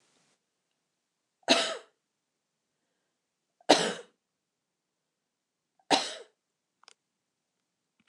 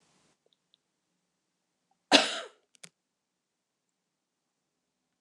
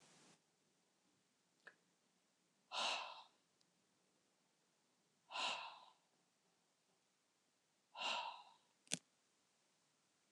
{"three_cough_length": "8.1 s", "three_cough_amplitude": 21678, "three_cough_signal_mean_std_ratio": 0.2, "cough_length": "5.2 s", "cough_amplitude": 23170, "cough_signal_mean_std_ratio": 0.15, "exhalation_length": "10.3 s", "exhalation_amplitude": 4004, "exhalation_signal_mean_std_ratio": 0.31, "survey_phase": "alpha (2021-03-01 to 2021-08-12)", "age": "65+", "gender": "Female", "wearing_mask": "No", "symptom_none": true, "smoker_status": "Never smoked", "respiratory_condition_asthma": false, "respiratory_condition_other": false, "recruitment_source": "REACT", "submission_delay": "2 days", "covid_test_result": "Negative", "covid_test_method": "RT-qPCR"}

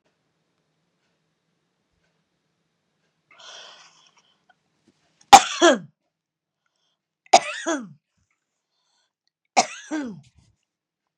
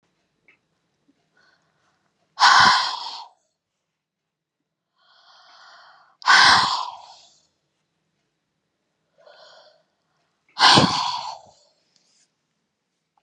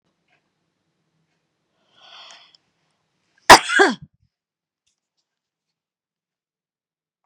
{"three_cough_length": "11.2 s", "three_cough_amplitude": 32768, "three_cough_signal_mean_std_ratio": 0.17, "exhalation_length": "13.2 s", "exhalation_amplitude": 31179, "exhalation_signal_mean_std_ratio": 0.28, "cough_length": "7.3 s", "cough_amplitude": 32768, "cough_signal_mean_std_ratio": 0.15, "survey_phase": "beta (2021-08-13 to 2022-03-07)", "age": "45-64", "gender": "Female", "wearing_mask": "No", "symptom_none": true, "smoker_status": "Ex-smoker", "respiratory_condition_asthma": false, "respiratory_condition_other": false, "recruitment_source": "REACT", "submission_delay": "2 days", "covid_test_result": "Negative", "covid_test_method": "RT-qPCR", "influenza_a_test_result": "Negative", "influenza_b_test_result": "Negative"}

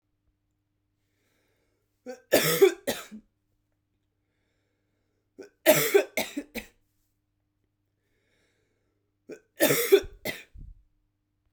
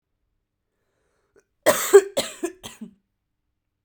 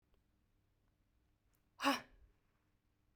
{"three_cough_length": "11.5 s", "three_cough_amplitude": 17146, "three_cough_signal_mean_std_ratio": 0.27, "cough_length": "3.8 s", "cough_amplitude": 32768, "cough_signal_mean_std_ratio": 0.23, "exhalation_length": "3.2 s", "exhalation_amplitude": 3504, "exhalation_signal_mean_std_ratio": 0.21, "survey_phase": "beta (2021-08-13 to 2022-03-07)", "age": "18-44", "gender": "Female", "wearing_mask": "No", "symptom_cough_any": true, "symptom_new_continuous_cough": true, "symptom_runny_or_blocked_nose": true, "symptom_shortness_of_breath": true, "symptom_sore_throat": true, "symptom_fatigue": true, "symptom_headache": true, "symptom_other": true, "smoker_status": "Current smoker (1 to 10 cigarettes per day)", "respiratory_condition_asthma": false, "respiratory_condition_other": false, "recruitment_source": "Test and Trace", "submission_delay": "1 day", "covid_test_result": "Positive", "covid_test_method": "RT-qPCR", "covid_ct_value": 32.8, "covid_ct_gene": "ORF1ab gene", "covid_ct_mean": 33.7, "covid_viral_load": "8.9 copies/ml", "covid_viral_load_category": "Minimal viral load (< 10K copies/ml)"}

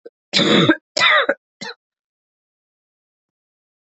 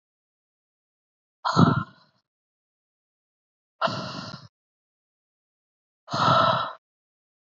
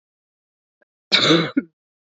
{"three_cough_length": "3.8 s", "three_cough_amplitude": 27435, "three_cough_signal_mean_std_ratio": 0.37, "exhalation_length": "7.4 s", "exhalation_amplitude": 20451, "exhalation_signal_mean_std_ratio": 0.31, "cough_length": "2.1 s", "cough_amplitude": 30043, "cough_signal_mean_std_ratio": 0.35, "survey_phase": "beta (2021-08-13 to 2022-03-07)", "age": "18-44", "gender": "Female", "wearing_mask": "No", "symptom_cough_any": true, "symptom_new_continuous_cough": true, "symptom_runny_or_blocked_nose": true, "symptom_shortness_of_breath": true, "symptom_sore_throat": true, "symptom_abdominal_pain": true, "symptom_diarrhoea": true, "symptom_fatigue": true, "symptom_fever_high_temperature": true, "symptom_headache": true, "symptom_change_to_sense_of_smell_or_taste": true, "symptom_loss_of_taste": true, "symptom_onset": "2 days", "smoker_status": "Never smoked", "respiratory_condition_asthma": false, "respiratory_condition_other": false, "recruitment_source": "Test and Trace", "submission_delay": "2 days", "covid_test_result": "Positive", "covid_test_method": "RT-qPCR", "covid_ct_value": 22.8, "covid_ct_gene": "N gene"}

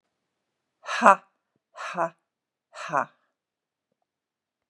{"exhalation_length": "4.7 s", "exhalation_amplitude": 31547, "exhalation_signal_mean_std_ratio": 0.2, "survey_phase": "beta (2021-08-13 to 2022-03-07)", "age": "65+", "gender": "Female", "wearing_mask": "No", "symptom_none": true, "smoker_status": "Never smoked", "respiratory_condition_asthma": false, "respiratory_condition_other": false, "recruitment_source": "REACT", "submission_delay": "1 day", "covid_test_result": "Negative", "covid_test_method": "RT-qPCR", "influenza_a_test_result": "Negative", "influenza_b_test_result": "Negative"}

